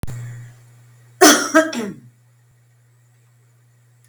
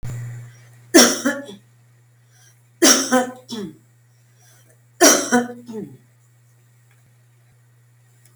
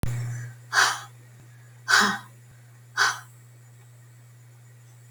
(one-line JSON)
{"cough_length": "4.1 s", "cough_amplitude": 32768, "cough_signal_mean_std_ratio": 0.32, "three_cough_length": "8.4 s", "three_cough_amplitude": 32768, "three_cough_signal_mean_std_ratio": 0.34, "exhalation_length": "5.1 s", "exhalation_amplitude": 22521, "exhalation_signal_mean_std_ratio": 0.43, "survey_phase": "beta (2021-08-13 to 2022-03-07)", "age": "65+", "gender": "Female", "wearing_mask": "No", "symptom_none": true, "smoker_status": "Never smoked", "respiratory_condition_asthma": false, "respiratory_condition_other": false, "recruitment_source": "REACT", "submission_delay": "12 days", "covid_test_result": "Negative", "covid_test_method": "RT-qPCR", "influenza_a_test_result": "Negative", "influenza_b_test_result": "Negative"}